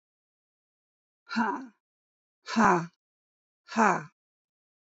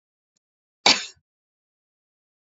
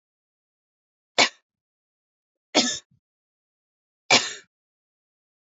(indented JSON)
{
  "exhalation_length": "4.9 s",
  "exhalation_amplitude": 13630,
  "exhalation_signal_mean_std_ratio": 0.3,
  "cough_length": "2.5 s",
  "cough_amplitude": 27245,
  "cough_signal_mean_std_ratio": 0.17,
  "three_cough_length": "5.5 s",
  "three_cough_amplitude": 26072,
  "three_cough_signal_mean_std_ratio": 0.21,
  "survey_phase": "beta (2021-08-13 to 2022-03-07)",
  "age": "18-44",
  "gender": "Female",
  "wearing_mask": "No",
  "symptom_cough_any": true,
  "symptom_runny_or_blocked_nose": true,
  "smoker_status": "Ex-smoker",
  "respiratory_condition_asthma": false,
  "respiratory_condition_other": false,
  "recruitment_source": "REACT",
  "submission_delay": "0 days",
  "covid_test_result": "Negative",
  "covid_test_method": "RT-qPCR"
}